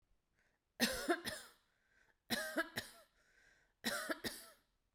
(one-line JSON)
{"three_cough_length": "4.9 s", "three_cough_amplitude": 3602, "three_cough_signal_mean_std_ratio": 0.41, "survey_phase": "beta (2021-08-13 to 2022-03-07)", "age": "18-44", "gender": "Female", "wearing_mask": "No", "symptom_none": true, "smoker_status": "Never smoked", "respiratory_condition_asthma": false, "respiratory_condition_other": false, "recruitment_source": "REACT", "submission_delay": "0 days", "covid_test_result": "Negative", "covid_test_method": "RT-qPCR"}